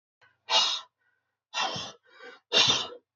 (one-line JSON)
{"exhalation_length": "3.2 s", "exhalation_amplitude": 13831, "exhalation_signal_mean_std_ratio": 0.43, "survey_phase": "beta (2021-08-13 to 2022-03-07)", "age": "45-64", "gender": "Male", "wearing_mask": "No", "symptom_cough_any": true, "smoker_status": "Never smoked", "respiratory_condition_asthma": false, "respiratory_condition_other": false, "recruitment_source": "Test and Trace", "submission_delay": "2 days", "covid_test_result": "Positive", "covid_test_method": "LFT"}